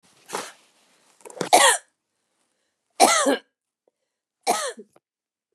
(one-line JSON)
{"three_cough_length": "5.5 s", "three_cough_amplitude": 31878, "three_cough_signal_mean_std_ratio": 0.31, "survey_phase": "beta (2021-08-13 to 2022-03-07)", "age": "45-64", "gender": "Female", "wearing_mask": "No", "symptom_fatigue": true, "symptom_headache": true, "symptom_onset": "13 days", "smoker_status": "Never smoked", "respiratory_condition_asthma": false, "respiratory_condition_other": false, "recruitment_source": "REACT", "submission_delay": "1 day", "covid_test_result": "Negative", "covid_test_method": "RT-qPCR", "influenza_a_test_result": "Unknown/Void", "influenza_b_test_result": "Unknown/Void"}